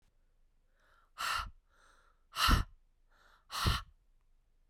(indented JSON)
{
  "exhalation_length": "4.7 s",
  "exhalation_amplitude": 5710,
  "exhalation_signal_mean_std_ratio": 0.33,
  "survey_phase": "beta (2021-08-13 to 2022-03-07)",
  "age": "18-44",
  "gender": "Female",
  "wearing_mask": "No",
  "symptom_cough_any": true,
  "symptom_runny_or_blocked_nose": true,
  "symptom_shortness_of_breath": true,
  "symptom_fatigue": true,
  "symptom_fever_high_temperature": true,
  "symptom_headache": true,
  "symptom_other": true,
  "smoker_status": "Never smoked",
  "respiratory_condition_asthma": true,
  "respiratory_condition_other": false,
  "recruitment_source": "Test and Trace",
  "submission_delay": "2 days",
  "covid_test_result": "Positive",
  "covid_test_method": "LFT"
}